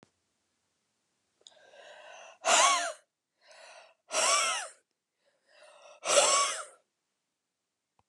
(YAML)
exhalation_length: 8.1 s
exhalation_amplitude: 10743
exhalation_signal_mean_std_ratio: 0.36
survey_phase: beta (2021-08-13 to 2022-03-07)
age: 45-64
gender: Female
wearing_mask: 'No'
symptom_cough_any: true
symptom_runny_or_blocked_nose: true
symptom_fatigue: true
symptom_fever_high_temperature: true
symptom_headache: true
symptom_change_to_sense_of_smell_or_taste: true
symptom_loss_of_taste: true
symptom_onset: 3 days
smoker_status: Never smoked
respiratory_condition_asthma: false
respiratory_condition_other: false
recruitment_source: Test and Trace
submission_delay: 2 days
covid_test_result: Positive
covid_test_method: RT-qPCR
covid_ct_value: 21.1
covid_ct_gene: N gene